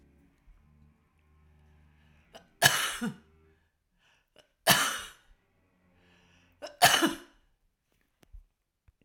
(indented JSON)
{
  "three_cough_length": "9.0 s",
  "three_cough_amplitude": 19695,
  "three_cough_signal_mean_std_ratio": 0.26,
  "survey_phase": "alpha (2021-03-01 to 2021-08-12)",
  "age": "65+",
  "gender": "Female",
  "wearing_mask": "No",
  "symptom_none": true,
  "smoker_status": "Ex-smoker",
  "respiratory_condition_asthma": false,
  "respiratory_condition_other": true,
  "recruitment_source": "REACT",
  "submission_delay": "1 day",
  "covid_test_result": "Negative",
  "covid_test_method": "RT-qPCR"
}